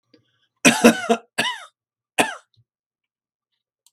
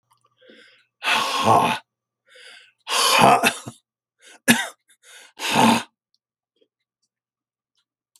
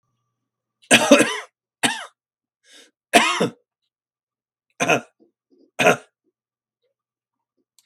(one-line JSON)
{"cough_length": "3.9 s", "cough_amplitude": 32768, "cough_signal_mean_std_ratio": 0.28, "exhalation_length": "8.2 s", "exhalation_amplitude": 32768, "exhalation_signal_mean_std_ratio": 0.38, "three_cough_length": "7.9 s", "three_cough_amplitude": 32768, "three_cough_signal_mean_std_ratio": 0.29, "survey_phase": "beta (2021-08-13 to 2022-03-07)", "age": "65+", "gender": "Male", "wearing_mask": "No", "symptom_shortness_of_breath": true, "symptom_sore_throat": true, "symptom_fatigue": true, "symptom_headache": true, "symptom_onset": "6 days", "smoker_status": "Ex-smoker", "respiratory_condition_asthma": false, "respiratory_condition_other": false, "recruitment_source": "Test and Trace", "submission_delay": "1 day", "covid_test_result": "Positive", "covid_test_method": "RT-qPCR", "covid_ct_value": 23.9, "covid_ct_gene": "ORF1ab gene", "covid_ct_mean": 24.0, "covid_viral_load": "13000 copies/ml", "covid_viral_load_category": "Low viral load (10K-1M copies/ml)"}